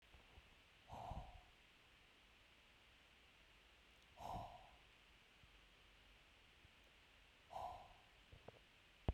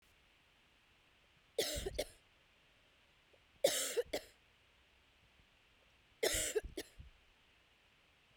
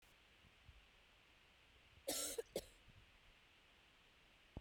{"exhalation_length": "9.1 s", "exhalation_amplitude": 1922, "exhalation_signal_mean_std_ratio": 0.45, "three_cough_length": "8.4 s", "three_cough_amplitude": 4081, "three_cough_signal_mean_std_ratio": 0.33, "cough_length": "4.6 s", "cough_amplitude": 997, "cough_signal_mean_std_ratio": 0.38, "survey_phase": "beta (2021-08-13 to 2022-03-07)", "age": "45-64", "gender": "Female", "wearing_mask": "No", "symptom_cough_any": true, "symptom_runny_or_blocked_nose": true, "symptom_diarrhoea": true, "symptom_fatigue": true, "symptom_headache": true, "symptom_other": true, "smoker_status": "Never smoked", "respiratory_condition_asthma": false, "respiratory_condition_other": false, "recruitment_source": "Test and Trace", "submission_delay": "1 day", "covid_test_result": "Positive", "covid_test_method": "RT-qPCR"}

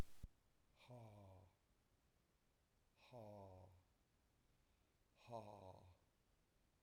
{"exhalation_length": "6.8 s", "exhalation_amplitude": 863, "exhalation_signal_mean_std_ratio": 0.39, "survey_phase": "beta (2021-08-13 to 2022-03-07)", "age": "65+", "gender": "Male", "wearing_mask": "No", "symptom_abdominal_pain": true, "symptom_onset": "12 days", "smoker_status": "Never smoked", "respiratory_condition_asthma": false, "respiratory_condition_other": false, "recruitment_source": "REACT", "submission_delay": "6 days", "covid_test_result": "Negative", "covid_test_method": "RT-qPCR", "influenza_a_test_result": "Negative", "influenza_b_test_result": "Negative"}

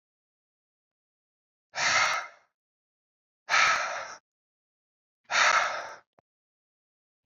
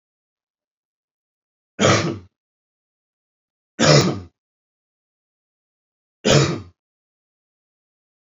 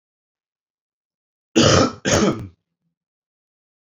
{"exhalation_length": "7.3 s", "exhalation_amplitude": 10601, "exhalation_signal_mean_std_ratio": 0.36, "three_cough_length": "8.4 s", "three_cough_amplitude": 32767, "three_cough_signal_mean_std_ratio": 0.27, "cough_length": "3.8 s", "cough_amplitude": 27762, "cough_signal_mean_std_ratio": 0.34, "survey_phase": "alpha (2021-03-01 to 2021-08-12)", "age": "18-44", "gender": "Male", "wearing_mask": "No", "symptom_cough_any": true, "symptom_fatigue": true, "symptom_headache": true, "smoker_status": "Never smoked", "respiratory_condition_asthma": false, "respiratory_condition_other": false, "recruitment_source": "Test and Trace", "submission_delay": "2 days", "covid_test_result": "Positive", "covid_test_method": "ePCR"}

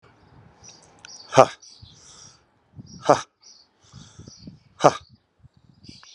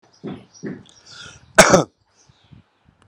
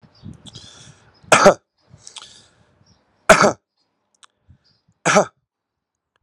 {"exhalation_length": "6.1 s", "exhalation_amplitude": 32768, "exhalation_signal_mean_std_ratio": 0.18, "cough_length": "3.1 s", "cough_amplitude": 32768, "cough_signal_mean_std_ratio": 0.25, "three_cough_length": "6.2 s", "three_cough_amplitude": 32768, "three_cough_signal_mean_std_ratio": 0.25, "survey_phase": "alpha (2021-03-01 to 2021-08-12)", "age": "45-64", "gender": "Male", "wearing_mask": "No", "symptom_none": true, "smoker_status": "Current smoker (11 or more cigarettes per day)", "respiratory_condition_asthma": false, "respiratory_condition_other": false, "recruitment_source": "REACT", "submission_delay": "3 days", "covid_test_result": "Negative", "covid_test_method": "RT-qPCR"}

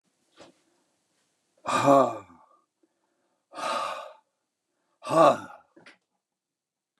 {"exhalation_length": "7.0 s", "exhalation_amplitude": 16613, "exhalation_signal_mean_std_ratio": 0.29, "survey_phase": "beta (2021-08-13 to 2022-03-07)", "age": "65+", "gender": "Male", "wearing_mask": "No", "symptom_none": true, "symptom_onset": "12 days", "smoker_status": "Ex-smoker", "respiratory_condition_asthma": false, "respiratory_condition_other": false, "recruitment_source": "REACT", "submission_delay": "2 days", "covid_test_result": "Negative", "covid_test_method": "RT-qPCR", "influenza_a_test_result": "Negative", "influenza_b_test_result": "Negative"}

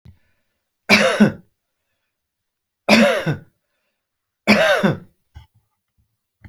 {"three_cough_length": "6.5 s", "three_cough_amplitude": 32767, "three_cough_signal_mean_std_ratio": 0.36, "survey_phase": "alpha (2021-03-01 to 2021-08-12)", "age": "45-64", "gender": "Male", "wearing_mask": "No", "symptom_none": true, "symptom_onset": "7 days", "smoker_status": "Never smoked", "respiratory_condition_asthma": false, "respiratory_condition_other": false, "recruitment_source": "REACT", "submission_delay": "2 days", "covid_test_result": "Negative", "covid_test_method": "RT-qPCR"}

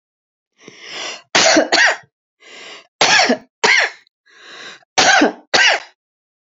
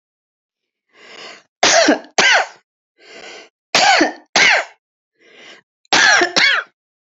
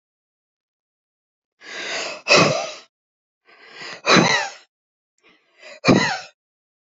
{"cough_length": "6.6 s", "cough_amplitude": 32768, "cough_signal_mean_std_ratio": 0.46, "three_cough_length": "7.2 s", "three_cough_amplitude": 32768, "three_cough_signal_mean_std_ratio": 0.45, "exhalation_length": "6.9 s", "exhalation_amplitude": 29219, "exhalation_signal_mean_std_ratio": 0.35, "survey_phase": "beta (2021-08-13 to 2022-03-07)", "age": "45-64", "gender": "Female", "wearing_mask": "No", "symptom_cough_any": true, "symptom_runny_or_blocked_nose": true, "symptom_onset": "12 days", "smoker_status": "Never smoked", "respiratory_condition_asthma": true, "respiratory_condition_other": false, "recruitment_source": "REACT", "submission_delay": "1 day", "covid_test_result": "Negative", "covid_test_method": "RT-qPCR", "influenza_a_test_result": "Negative", "influenza_b_test_result": "Negative"}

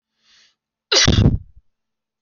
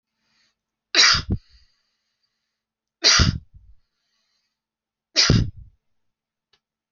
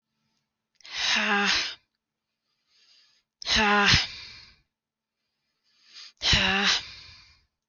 {"cough_length": "2.2 s", "cough_amplitude": 31078, "cough_signal_mean_std_ratio": 0.36, "three_cough_length": "6.9 s", "three_cough_amplitude": 27082, "three_cough_signal_mean_std_ratio": 0.3, "exhalation_length": "7.7 s", "exhalation_amplitude": 17149, "exhalation_signal_mean_std_ratio": 0.43, "survey_phase": "beta (2021-08-13 to 2022-03-07)", "age": "18-44", "gender": "Female", "wearing_mask": "No", "symptom_runny_or_blocked_nose": true, "symptom_onset": "7 days", "smoker_status": "Never smoked", "respiratory_condition_asthma": false, "respiratory_condition_other": false, "recruitment_source": "REACT", "submission_delay": "2 days", "covid_test_result": "Negative", "covid_test_method": "RT-qPCR", "influenza_a_test_result": "Negative", "influenza_b_test_result": "Negative"}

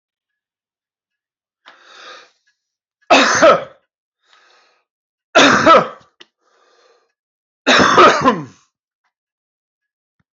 {"three_cough_length": "10.3 s", "three_cough_amplitude": 30727, "three_cough_signal_mean_std_ratio": 0.33, "survey_phase": "alpha (2021-03-01 to 2021-08-12)", "age": "45-64", "gender": "Male", "wearing_mask": "No", "symptom_cough_any": true, "symptom_new_continuous_cough": true, "symptom_fatigue": true, "symptom_fever_high_temperature": true, "symptom_headache": true, "symptom_change_to_sense_of_smell_or_taste": true, "symptom_onset": "4 days", "smoker_status": "Ex-smoker", "respiratory_condition_asthma": false, "respiratory_condition_other": false, "recruitment_source": "Test and Trace", "submission_delay": "1 day", "covid_test_result": "Positive", "covid_test_method": "RT-qPCR", "covid_ct_value": 14.9, "covid_ct_gene": "ORF1ab gene", "covid_ct_mean": 15.2, "covid_viral_load": "10000000 copies/ml", "covid_viral_load_category": "High viral load (>1M copies/ml)"}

